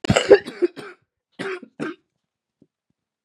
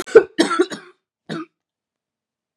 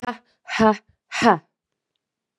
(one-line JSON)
{"cough_length": "3.2 s", "cough_amplitude": 32670, "cough_signal_mean_std_ratio": 0.27, "three_cough_length": "2.6 s", "three_cough_amplitude": 32768, "three_cough_signal_mean_std_ratio": 0.27, "exhalation_length": "2.4 s", "exhalation_amplitude": 28298, "exhalation_signal_mean_std_ratio": 0.33, "survey_phase": "beta (2021-08-13 to 2022-03-07)", "age": "18-44", "gender": "Female", "wearing_mask": "No", "symptom_cough_any": true, "symptom_runny_or_blocked_nose": true, "symptom_sore_throat": true, "symptom_headache": true, "symptom_onset": "3 days", "smoker_status": "Ex-smoker", "respiratory_condition_asthma": false, "respiratory_condition_other": false, "recruitment_source": "Test and Trace", "submission_delay": "1 day", "covid_test_result": "Positive", "covid_test_method": "RT-qPCR"}